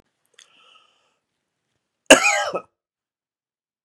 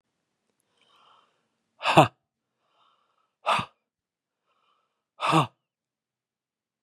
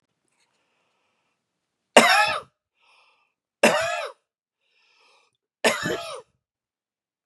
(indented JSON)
{
  "cough_length": "3.8 s",
  "cough_amplitude": 32768,
  "cough_signal_mean_std_ratio": 0.21,
  "exhalation_length": "6.8 s",
  "exhalation_amplitude": 32063,
  "exhalation_signal_mean_std_ratio": 0.21,
  "three_cough_length": "7.3 s",
  "three_cough_amplitude": 32767,
  "three_cough_signal_mean_std_ratio": 0.28,
  "survey_phase": "beta (2021-08-13 to 2022-03-07)",
  "age": "18-44",
  "gender": "Male",
  "wearing_mask": "No",
  "symptom_sore_throat": true,
  "symptom_fatigue": true,
  "symptom_onset": "2 days",
  "smoker_status": "Never smoked",
  "respiratory_condition_asthma": false,
  "respiratory_condition_other": false,
  "recruitment_source": "Test and Trace",
  "submission_delay": "1 day",
  "covid_test_result": "Positive",
  "covid_test_method": "RT-qPCR",
  "covid_ct_value": 16.8,
  "covid_ct_gene": "ORF1ab gene",
  "covid_ct_mean": 17.4,
  "covid_viral_load": "2000000 copies/ml",
  "covid_viral_load_category": "High viral load (>1M copies/ml)"
}